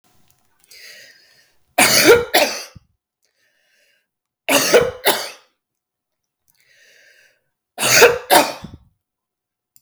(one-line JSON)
{"three_cough_length": "9.8 s", "three_cough_amplitude": 32768, "three_cough_signal_mean_std_ratio": 0.34, "survey_phase": "beta (2021-08-13 to 2022-03-07)", "age": "65+", "gender": "Female", "wearing_mask": "No", "symptom_cough_any": true, "smoker_status": "Never smoked", "respiratory_condition_asthma": false, "respiratory_condition_other": true, "recruitment_source": "REACT", "submission_delay": "2 days", "covid_test_result": "Negative", "covid_test_method": "RT-qPCR", "influenza_a_test_result": "Negative", "influenza_b_test_result": "Negative"}